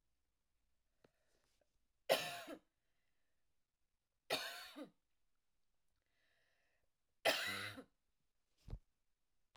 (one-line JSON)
{"three_cough_length": "9.6 s", "three_cough_amplitude": 3687, "three_cough_signal_mean_std_ratio": 0.26, "survey_phase": "alpha (2021-03-01 to 2021-08-12)", "age": "18-44", "gender": "Female", "wearing_mask": "No", "symptom_none": true, "smoker_status": "Never smoked", "respiratory_condition_asthma": false, "respiratory_condition_other": false, "recruitment_source": "REACT", "submission_delay": "1 day", "covid_test_result": "Negative", "covid_test_method": "RT-qPCR"}